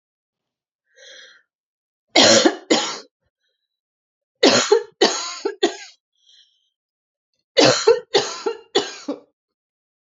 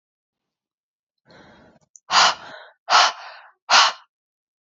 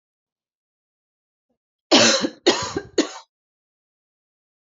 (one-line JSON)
{"three_cough_length": "10.2 s", "three_cough_amplitude": 32215, "three_cough_signal_mean_std_ratio": 0.35, "exhalation_length": "4.6 s", "exhalation_amplitude": 28777, "exhalation_signal_mean_std_ratio": 0.32, "cough_length": "4.8 s", "cough_amplitude": 30579, "cough_signal_mean_std_ratio": 0.29, "survey_phase": "beta (2021-08-13 to 2022-03-07)", "age": "18-44", "gender": "Female", "wearing_mask": "No", "symptom_cough_any": true, "symptom_runny_or_blocked_nose": true, "symptom_sore_throat": true, "symptom_abdominal_pain": true, "symptom_diarrhoea": true, "symptom_fatigue": true, "symptom_headache": true, "symptom_other": true, "symptom_onset": "6 days", "smoker_status": "Never smoked", "respiratory_condition_asthma": true, "respiratory_condition_other": false, "recruitment_source": "Test and Trace", "submission_delay": "1 day", "covid_test_result": "Negative", "covid_test_method": "ePCR"}